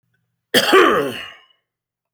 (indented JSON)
{
  "cough_length": "2.1 s",
  "cough_amplitude": 30671,
  "cough_signal_mean_std_ratio": 0.42,
  "survey_phase": "alpha (2021-03-01 to 2021-08-12)",
  "age": "65+",
  "gender": "Male",
  "wearing_mask": "No",
  "symptom_none": true,
  "smoker_status": "Ex-smoker",
  "respiratory_condition_asthma": false,
  "respiratory_condition_other": false,
  "recruitment_source": "REACT",
  "submission_delay": "1 day",
  "covid_test_result": "Negative",
  "covid_test_method": "RT-qPCR"
}